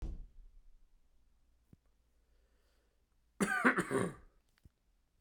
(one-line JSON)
{"cough_length": "5.2 s", "cough_amplitude": 5707, "cough_signal_mean_std_ratio": 0.31, "survey_phase": "beta (2021-08-13 to 2022-03-07)", "age": "45-64", "gender": "Male", "wearing_mask": "No", "symptom_runny_or_blocked_nose": true, "symptom_fatigue": true, "symptom_change_to_sense_of_smell_or_taste": true, "smoker_status": "Never smoked", "respiratory_condition_asthma": false, "respiratory_condition_other": false, "recruitment_source": "Test and Trace", "submission_delay": "2 days", "covid_test_result": "Positive", "covid_test_method": "RT-qPCR", "covid_ct_value": 17.7, "covid_ct_gene": "ORF1ab gene", "covid_ct_mean": 18.3, "covid_viral_load": "1000000 copies/ml", "covid_viral_load_category": "High viral load (>1M copies/ml)"}